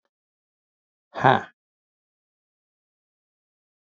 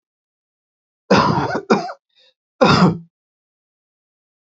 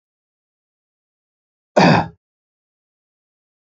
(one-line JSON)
{"exhalation_length": "3.8 s", "exhalation_amplitude": 28053, "exhalation_signal_mean_std_ratio": 0.16, "three_cough_length": "4.4 s", "three_cough_amplitude": 28573, "three_cough_signal_mean_std_ratio": 0.37, "cough_length": "3.7 s", "cough_amplitude": 28240, "cough_signal_mean_std_ratio": 0.22, "survey_phase": "beta (2021-08-13 to 2022-03-07)", "age": "45-64", "gender": "Male", "wearing_mask": "No", "symptom_none": true, "smoker_status": "Never smoked", "respiratory_condition_asthma": false, "respiratory_condition_other": false, "recruitment_source": "REACT", "submission_delay": "2 days", "covid_test_result": "Negative", "covid_test_method": "RT-qPCR"}